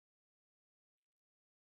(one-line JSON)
{"cough_length": "1.7 s", "cough_amplitude": 1, "cough_signal_mean_std_ratio": 0.04, "survey_phase": "beta (2021-08-13 to 2022-03-07)", "age": "45-64", "gender": "Male", "wearing_mask": "No", "symptom_cough_any": true, "symptom_runny_or_blocked_nose": true, "smoker_status": "Current smoker (11 or more cigarettes per day)", "respiratory_condition_asthma": false, "respiratory_condition_other": false, "recruitment_source": "REACT", "submission_delay": "3 days", "covid_test_result": "Negative", "covid_test_method": "RT-qPCR"}